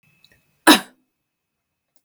{
  "cough_length": "2.0 s",
  "cough_amplitude": 32768,
  "cough_signal_mean_std_ratio": 0.18,
  "survey_phase": "beta (2021-08-13 to 2022-03-07)",
  "age": "45-64",
  "gender": "Female",
  "wearing_mask": "No",
  "symptom_none": true,
  "smoker_status": "Ex-smoker",
  "respiratory_condition_asthma": false,
  "respiratory_condition_other": false,
  "recruitment_source": "REACT",
  "submission_delay": "1 day",
  "covid_test_result": "Negative",
  "covid_test_method": "RT-qPCR"
}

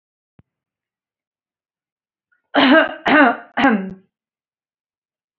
{
  "cough_length": "5.4 s",
  "cough_amplitude": 29213,
  "cough_signal_mean_std_ratio": 0.34,
  "survey_phase": "beta (2021-08-13 to 2022-03-07)",
  "age": "18-44",
  "gender": "Female",
  "wearing_mask": "No",
  "symptom_fatigue": true,
  "symptom_onset": "12 days",
  "smoker_status": "Never smoked",
  "respiratory_condition_asthma": false,
  "respiratory_condition_other": true,
  "recruitment_source": "REACT",
  "submission_delay": "3 days",
  "covid_test_result": "Negative",
  "covid_test_method": "RT-qPCR"
}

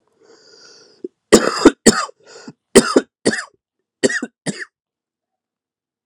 {
  "three_cough_length": "6.1 s",
  "three_cough_amplitude": 32768,
  "three_cough_signal_mean_std_ratio": 0.28,
  "survey_phase": "alpha (2021-03-01 to 2021-08-12)",
  "age": "18-44",
  "gender": "Male",
  "wearing_mask": "No",
  "symptom_shortness_of_breath": true,
  "symptom_fatigue": true,
  "symptom_fever_high_temperature": true,
  "symptom_change_to_sense_of_smell_or_taste": true,
  "symptom_onset": "4 days",
  "smoker_status": "Ex-smoker",
  "respiratory_condition_asthma": false,
  "respiratory_condition_other": false,
  "recruitment_source": "Test and Trace",
  "submission_delay": "2 days",
  "covid_test_result": "Positive",
  "covid_test_method": "RT-qPCR",
  "covid_ct_value": 11.3,
  "covid_ct_gene": "N gene",
  "covid_ct_mean": 11.7,
  "covid_viral_load": "150000000 copies/ml",
  "covid_viral_load_category": "High viral load (>1M copies/ml)"
}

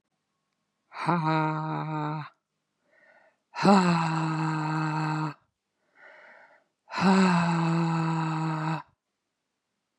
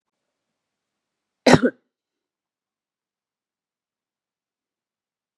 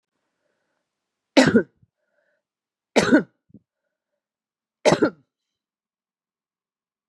{
  "exhalation_length": "10.0 s",
  "exhalation_amplitude": 16306,
  "exhalation_signal_mean_std_ratio": 0.59,
  "cough_length": "5.4 s",
  "cough_amplitude": 32768,
  "cough_signal_mean_std_ratio": 0.13,
  "three_cough_length": "7.1 s",
  "three_cough_amplitude": 28850,
  "three_cough_signal_mean_std_ratio": 0.23,
  "survey_phase": "beta (2021-08-13 to 2022-03-07)",
  "age": "45-64",
  "gender": "Female",
  "wearing_mask": "No",
  "symptom_cough_any": true,
  "symptom_onset": "12 days",
  "smoker_status": "Ex-smoker",
  "respiratory_condition_asthma": false,
  "respiratory_condition_other": false,
  "recruitment_source": "REACT",
  "submission_delay": "1 day",
  "covid_test_result": "Negative",
  "covid_test_method": "RT-qPCR",
  "influenza_a_test_result": "Negative",
  "influenza_b_test_result": "Negative"
}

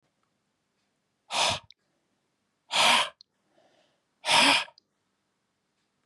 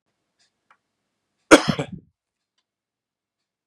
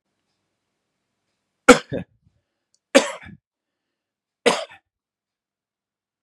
{
  "exhalation_length": "6.1 s",
  "exhalation_amplitude": 13665,
  "exhalation_signal_mean_std_ratio": 0.32,
  "cough_length": "3.7 s",
  "cough_amplitude": 32768,
  "cough_signal_mean_std_ratio": 0.15,
  "three_cough_length": "6.2 s",
  "three_cough_amplitude": 32768,
  "three_cough_signal_mean_std_ratio": 0.17,
  "survey_phase": "beta (2021-08-13 to 2022-03-07)",
  "age": "45-64",
  "gender": "Male",
  "wearing_mask": "No",
  "symptom_none": true,
  "smoker_status": "Never smoked",
  "respiratory_condition_asthma": false,
  "respiratory_condition_other": false,
  "recruitment_source": "Test and Trace",
  "submission_delay": "1 day",
  "covid_test_result": "Positive",
  "covid_test_method": "LFT"
}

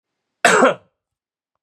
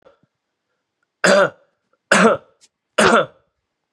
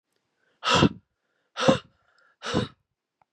{
  "cough_length": "1.6 s",
  "cough_amplitude": 32680,
  "cough_signal_mean_std_ratio": 0.34,
  "three_cough_length": "3.9 s",
  "three_cough_amplitude": 32768,
  "three_cough_signal_mean_std_ratio": 0.36,
  "exhalation_length": "3.3 s",
  "exhalation_amplitude": 20400,
  "exhalation_signal_mean_std_ratio": 0.32,
  "survey_phase": "beta (2021-08-13 to 2022-03-07)",
  "age": "45-64",
  "gender": "Male",
  "wearing_mask": "No",
  "symptom_none": true,
  "smoker_status": "Ex-smoker",
  "respiratory_condition_asthma": false,
  "respiratory_condition_other": false,
  "recruitment_source": "REACT",
  "submission_delay": "7 days",
  "covid_test_result": "Negative",
  "covid_test_method": "RT-qPCR",
  "influenza_a_test_result": "Negative",
  "influenza_b_test_result": "Negative"
}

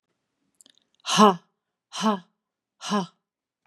{
  "exhalation_length": "3.7 s",
  "exhalation_amplitude": 27048,
  "exhalation_signal_mean_std_ratio": 0.28,
  "survey_phase": "beta (2021-08-13 to 2022-03-07)",
  "age": "45-64",
  "gender": "Female",
  "wearing_mask": "No",
  "symptom_none": true,
  "smoker_status": "Ex-smoker",
  "respiratory_condition_asthma": false,
  "respiratory_condition_other": false,
  "recruitment_source": "Test and Trace",
  "submission_delay": "4 days",
  "covid_test_result": "Negative",
  "covid_test_method": "RT-qPCR"
}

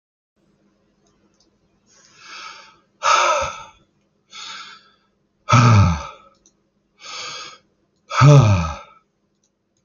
{
  "exhalation_length": "9.8 s",
  "exhalation_amplitude": 31985,
  "exhalation_signal_mean_std_ratio": 0.34,
  "survey_phase": "alpha (2021-03-01 to 2021-08-12)",
  "age": "45-64",
  "gender": "Male",
  "wearing_mask": "No",
  "symptom_none": true,
  "smoker_status": "Ex-smoker",
  "respiratory_condition_asthma": false,
  "respiratory_condition_other": false,
  "recruitment_source": "REACT",
  "submission_delay": "5 days",
  "covid_test_result": "Negative",
  "covid_test_method": "RT-qPCR"
}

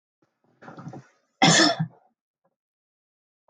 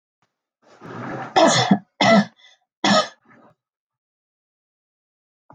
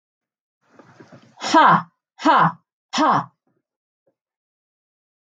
{
  "cough_length": "3.5 s",
  "cough_amplitude": 19104,
  "cough_signal_mean_std_ratio": 0.29,
  "three_cough_length": "5.5 s",
  "three_cough_amplitude": 26348,
  "three_cough_signal_mean_std_ratio": 0.35,
  "exhalation_length": "5.4 s",
  "exhalation_amplitude": 26043,
  "exhalation_signal_mean_std_ratio": 0.34,
  "survey_phase": "beta (2021-08-13 to 2022-03-07)",
  "age": "45-64",
  "gender": "Female",
  "wearing_mask": "No",
  "symptom_none": true,
  "smoker_status": "Never smoked",
  "respiratory_condition_asthma": false,
  "respiratory_condition_other": false,
  "recruitment_source": "REACT",
  "submission_delay": "2 days",
  "covid_test_result": "Negative",
  "covid_test_method": "RT-qPCR",
  "influenza_a_test_result": "Negative",
  "influenza_b_test_result": "Negative"
}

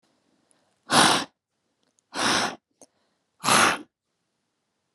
{
  "exhalation_length": "4.9 s",
  "exhalation_amplitude": 20566,
  "exhalation_signal_mean_std_ratio": 0.35,
  "survey_phase": "beta (2021-08-13 to 2022-03-07)",
  "age": "18-44",
  "gender": "Female",
  "wearing_mask": "No",
  "symptom_none": true,
  "smoker_status": "Never smoked",
  "respiratory_condition_asthma": false,
  "respiratory_condition_other": false,
  "recruitment_source": "REACT",
  "submission_delay": "1 day",
  "covid_test_result": "Negative",
  "covid_test_method": "RT-qPCR",
  "influenza_a_test_result": "Negative",
  "influenza_b_test_result": "Negative"
}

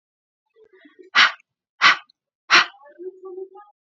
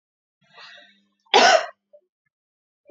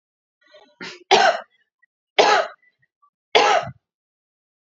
{
  "exhalation_length": "3.8 s",
  "exhalation_amplitude": 29278,
  "exhalation_signal_mean_std_ratio": 0.29,
  "cough_length": "2.9 s",
  "cough_amplitude": 29207,
  "cough_signal_mean_std_ratio": 0.26,
  "three_cough_length": "4.6 s",
  "three_cough_amplitude": 31870,
  "three_cough_signal_mean_std_ratio": 0.35,
  "survey_phase": "beta (2021-08-13 to 2022-03-07)",
  "age": "18-44",
  "gender": "Female",
  "wearing_mask": "No",
  "symptom_none": true,
  "smoker_status": "Never smoked",
  "respiratory_condition_asthma": false,
  "respiratory_condition_other": false,
  "recruitment_source": "REACT",
  "submission_delay": "1 day",
  "covid_test_result": "Negative",
  "covid_test_method": "RT-qPCR",
  "influenza_a_test_result": "Negative",
  "influenza_b_test_result": "Negative"
}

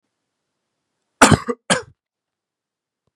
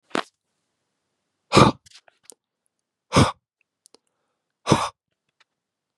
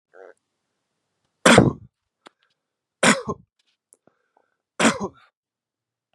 {
  "cough_length": "3.2 s",
  "cough_amplitude": 32768,
  "cough_signal_mean_std_ratio": 0.21,
  "exhalation_length": "6.0 s",
  "exhalation_amplitude": 32766,
  "exhalation_signal_mean_std_ratio": 0.22,
  "three_cough_length": "6.1 s",
  "three_cough_amplitude": 32755,
  "three_cough_signal_mean_std_ratio": 0.24,
  "survey_phase": "beta (2021-08-13 to 2022-03-07)",
  "age": "18-44",
  "gender": "Male",
  "wearing_mask": "No",
  "symptom_cough_any": true,
  "symptom_new_continuous_cough": true,
  "symptom_runny_or_blocked_nose": true,
  "symptom_fatigue": true,
  "symptom_fever_high_temperature": true,
  "symptom_headache": true,
  "symptom_other": true,
  "symptom_onset": "4 days",
  "smoker_status": "Never smoked",
  "respiratory_condition_asthma": false,
  "respiratory_condition_other": false,
  "recruitment_source": "Test and Trace",
  "submission_delay": "2 days",
  "covid_test_result": "Positive",
  "covid_test_method": "RT-qPCR",
  "covid_ct_value": 14.7,
  "covid_ct_gene": "ORF1ab gene",
  "covid_ct_mean": 14.8,
  "covid_viral_load": "14000000 copies/ml",
  "covid_viral_load_category": "High viral load (>1M copies/ml)"
}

